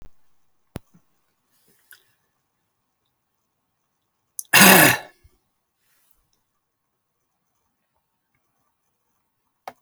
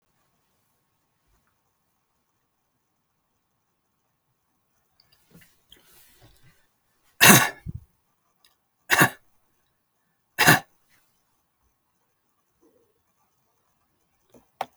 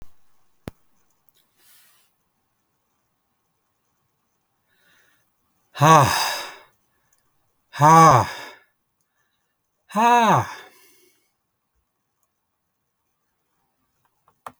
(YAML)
cough_length: 9.8 s
cough_amplitude: 32768
cough_signal_mean_std_ratio: 0.17
three_cough_length: 14.8 s
three_cough_amplitude: 32768
three_cough_signal_mean_std_ratio: 0.16
exhalation_length: 14.6 s
exhalation_amplitude: 32767
exhalation_signal_mean_std_ratio: 0.26
survey_phase: alpha (2021-03-01 to 2021-08-12)
age: 65+
gender: Male
wearing_mask: 'No'
symptom_none: true
smoker_status: Never smoked
respiratory_condition_asthma: false
respiratory_condition_other: false
recruitment_source: REACT
submission_delay: 1 day
covid_test_result: Negative
covid_test_method: RT-qPCR